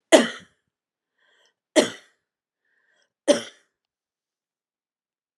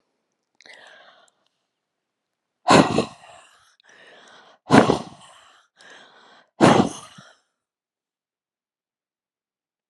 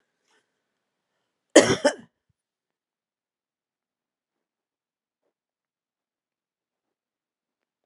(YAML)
three_cough_length: 5.4 s
three_cough_amplitude: 32751
three_cough_signal_mean_std_ratio: 0.19
exhalation_length: 9.9 s
exhalation_amplitude: 32768
exhalation_signal_mean_std_ratio: 0.24
cough_length: 7.9 s
cough_amplitude: 31838
cough_signal_mean_std_ratio: 0.13
survey_phase: beta (2021-08-13 to 2022-03-07)
age: 65+
gender: Female
wearing_mask: 'No'
symptom_none: true
smoker_status: Ex-smoker
respiratory_condition_asthma: false
respiratory_condition_other: false
recruitment_source: REACT
submission_delay: 3 days
covid_test_result: Negative
covid_test_method: RT-qPCR